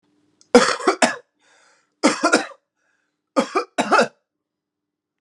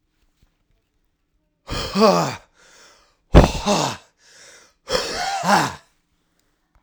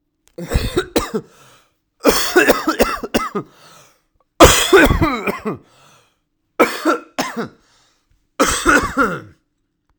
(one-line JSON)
{"three_cough_length": "5.2 s", "three_cough_amplitude": 32767, "three_cough_signal_mean_std_ratio": 0.35, "exhalation_length": "6.8 s", "exhalation_amplitude": 32768, "exhalation_signal_mean_std_ratio": 0.36, "cough_length": "10.0 s", "cough_amplitude": 32768, "cough_signal_mean_std_ratio": 0.45, "survey_phase": "alpha (2021-03-01 to 2021-08-12)", "age": "18-44", "gender": "Male", "wearing_mask": "No", "symptom_cough_any": true, "symptom_shortness_of_breath": true, "symptom_abdominal_pain": true, "symptom_fatigue": true, "symptom_fever_high_temperature": true, "symptom_headache": true, "symptom_change_to_sense_of_smell_or_taste": true, "symptom_onset": "4 days", "smoker_status": "Current smoker (e-cigarettes or vapes only)", "respiratory_condition_asthma": true, "respiratory_condition_other": false, "recruitment_source": "Test and Trace", "submission_delay": "1 day", "covid_test_result": "Positive", "covid_test_method": "RT-qPCR", "covid_ct_value": 14.0, "covid_ct_gene": "ORF1ab gene", "covid_ct_mean": 15.0, "covid_viral_load": "12000000 copies/ml", "covid_viral_load_category": "High viral load (>1M copies/ml)"}